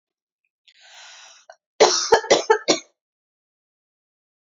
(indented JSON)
{
  "cough_length": "4.4 s",
  "cough_amplitude": 28407,
  "cough_signal_mean_std_ratio": 0.29,
  "survey_phase": "beta (2021-08-13 to 2022-03-07)",
  "age": "18-44",
  "gender": "Female",
  "wearing_mask": "No",
  "symptom_cough_any": true,
  "symptom_new_continuous_cough": true,
  "symptom_shortness_of_breath": true,
  "symptom_sore_throat": true,
  "symptom_fatigue": true,
  "symptom_headache": true,
  "symptom_onset": "3 days",
  "smoker_status": "Never smoked",
  "respiratory_condition_asthma": false,
  "respiratory_condition_other": false,
  "recruitment_source": "Test and Trace",
  "submission_delay": "2 days",
  "covid_test_result": "Positive",
  "covid_test_method": "RT-qPCR",
  "covid_ct_value": 26.6,
  "covid_ct_gene": "ORF1ab gene"
}